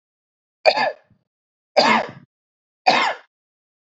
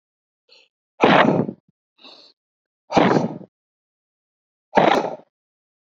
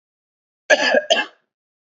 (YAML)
three_cough_length: 3.8 s
three_cough_amplitude: 32767
three_cough_signal_mean_std_ratio: 0.35
exhalation_length: 6.0 s
exhalation_amplitude: 30332
exhalation_signal_mean_std_ratio: 0.34
cough_length: 2.0 s
cough_amplitude: 27844
cough_signal_mean_std_ratio: 0.37
survey_phase: beta (2021-08-13 to 2022-03-07)
age: 18-44
gender: Male
wearing_mask: 'No'
symptom_none: true
smoker_status: Ex-smoker
respiratory_condition_asthma: false
respiratory_condition_other: false
recruitment_source: REACT
submission_delay: 3 days
covid_test_result: Negative
covid_test_method: RT-qPCR
influenza_a_test_result: Negative
influenza_b_test_result: Negative